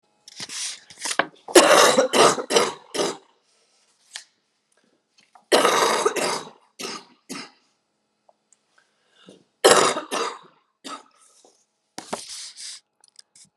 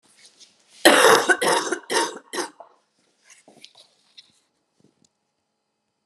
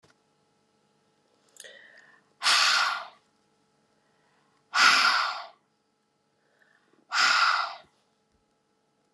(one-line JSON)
{"three_cough_length": "13.6 s", "three_cough_amplitude": 32767, "three_cough_signal_mean_std_ratio": 0.36, "cough_length": "6.1 s", "cough_amplitude": 32767, "cough_signal_mean_std_ratio": 0.32, "exhalation_length": "9.1 s", "exhalation_amplitude": 17095, "exhalation_signal_mean_std_ratio": 0.37, "survey_phase": "beta (2021-08-13 to 2022-03-07)", "age": "45-64", "gender": "Male", "wearing_mask": "Yes", "symptom_new_continuous_cough": true, "symptom_runny_or_blocked_nose": true, "symptom_sore_throat": true, "symptom_fatigue": true, "symptom_headache": true, "symptom_change_to_sense_of_smell_or_taste": true, "symptom_onset": "21 days", "smoker_status": "Current smoker (1 to 10 cigarettes per day)", "respiratory_condition_asthma": false, "respiratory_condition_other": false, "recruitment_source": "Test and Trace", "submission_delay": "19 days", "covid_test_result": "Negative", "covid_test_method": "RT-qPCR"}